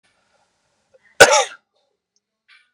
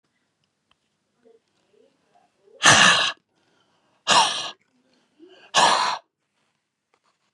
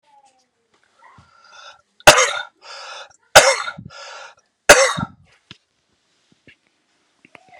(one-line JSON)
{"cough_length": "2.7 s", "cough_amplitude": 32768, "cough_signal_mean_std_ratio": 0.21, "exhalation_length": "7.3 s", "exhalation_amplitude": 32718, "exhalation_signal_mean_std_ratio": 0.32, "three_cough_length": "7.6 s", "three_cough_amplitude": 32768, "three_cough_signal_mean_std_ratio": 0.25, "survey_phase": "beta (2021-08-13 to 2022-03-07)", "age": "18-44", "gender": "Male", "wearing_mask": "No", "symptom_cough_any": true, "symptom_runny_or_blocked_nose": true, "symptom_fever_high_temperature": true, "smoker_status": "Never smoked", "respiratory_condition_asthma": false, "respiratory_condition_other": false, "recruitment_source": "Test and Trace", "submission_delay": "2 days", "covid_test_result": "Positive", "covid_test_method": "RT-qPCR"}